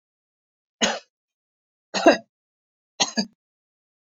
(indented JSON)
{
  "three_cough_length": "4.1 s",
  "three_cough_amplitude": 28254,
  "three_cough_signal_mean_std_ratio": 0.23,
  "survey_phase": "beta (2021-08-13 to 2022-03-07)",
  "age": "45-64",
  "gender": "Female",
  "wearing_mask": "No",
  "symptom_none": true,
  "smoker_status": "Ex-smoker",
  "respiratory_condition_asthma": false,
  "respiratory_condition_other": false,
  "recruitment_source": "REACT",
  "submission_delay": "3 days",
  "covid_test_result": "Negative",
  "covid_test_method": "RT-qPCR",
  "influenza_a_test_result": "Negative",
  "influenza_b_test_result": "Negative"
}